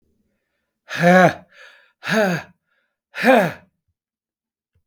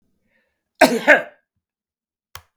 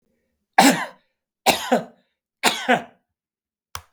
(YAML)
exhalation_length: 4.9 s
exhalation_amplitude: 30721
exhalation_signal_mean_std_ratio: 0.36
cough_length: 2.6 s
cough_amplitude: 32768
cough_signal_mean_std_ratio: 0.26
three_cough_length: 3.9 s
three_cough_amplitude: 32768
three_cough_signal_mean_std_ratio: 0.34
survey_phase: beta (2021-08-13 to 2022-03-07)
age: 65+
gender: Male
wearing_mask: 'No'
symptom_none: true
smoker_status: Never smoked
respiratory_condition_asthma: false
respiratory_condition_other: false
recruitment_source: REACT
submission_delay: 3 days
covid_test_result: Negative
covid_test_method: RT-qPCR
influenza_a_test_result: Negative
influenza_b_test_result: Negative